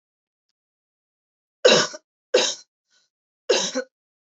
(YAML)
three_cough_length: 4.4 s
three_cough_amplitude: 25659
three_cough_signal_mean_std_ratio: 0.3
survey_phase: alpha (2021-03-01 to 2021-08-12)
age: 18-44
gender: Female
wearing_mask: 'No'
symptom_none: true
symptom_onset: 12 days
smoker_status: Never smoked
respiratory_condition_asthma: false
respiratory_condition_other: false
recruitment_source: REACT
submission_delay: 2 days
covid_test_result: Negative
covid_test_method: RT-qPCR